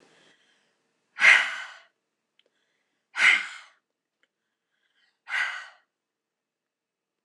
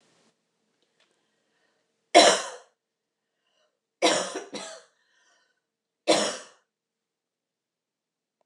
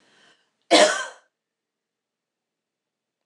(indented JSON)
{
  "exhalation_length": "7.2 s",
  "exhalation_amplitude": 20882,
  "exhalation_signal_mean_std_ratio": 0.25,
  "three_cough_length": "8.5 s",
  "three_cough_amplitude": 23773,
  "three_cough_signal_mean_std_ratio": 0.23,
  "cough_length": "3.3 s",
  "cough_amplitude": 24466,
  "cough_signal_mean_std_ratio": 0.23,
  "survey_phase": "beta (2021-08-13 to 2022-03-07)",
  "age": "65+",
  "gender": "Female",
  "wearing_mask": "No",
  "symptom_none": true,
  "smoker_status": "Ex-smoker",
  "respiratory_condition_asthma": false,
  "respiratory_condition_other": false,
  "recruitment_source": "REACT",
  "submission_delay": "2 days",
  "covid_test_result": "Negative",
  "covid_test_method": "RT-qPCR"
}